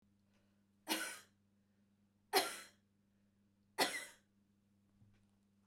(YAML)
three_cough_length: 5.7 s
three_cough_amplitude: 4059
three_cough_signal_mean_std_ratio: 0.27
survey_phase: beta (2021-08-13 to 2022-03-07)
age: 65+
gender: Female
wearing_mask: 'No'
symptom_none: true
smoker_status: Never smoked
respiratory_condition_asthma: false
respiratory_condition_other: false
recruitment_source: REACT
submission_delay: 2 days
covid_test_result: Negative
covid_test_method: RT-qPCR
influenza_a_test_result: Negative
influenza_b_test_result: Negative